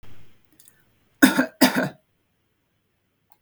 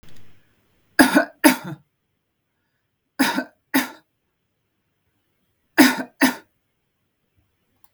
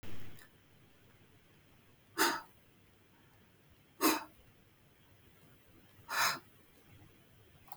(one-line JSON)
{"cough_length": "3.4 s", "cough_amplitude": 32766, "cough_signal_mean_std_ratio": 0.29, "three_cough_length": "7.9 s", "three_cough_amplitude": 32768, "three_cough_signal_mean_std_ratio": 0.28, "exhalation_length": "7.8 s", "exhalation_amplitude": 5135, "exhalation_signal_mean_std_ratio": 0.35, "survey_phase": "beta (2021-08-13 to 2022-03-07)", "age": "45-64", "gender": "Female", "wearing_mask": "No", "symptom_none": true, "smoker_status": "Ex-smoker", "respiratory_condition_asthma": false, "respiratory_condition_other": false, "recruitment_source": "REACT", "submission_delay": "1 day", "covid_test_result": "Negative", "covid_test_method": "RT-qPCR", "influenza_a_test_result": "Negative", "influenza_b_test_result": "Negative"}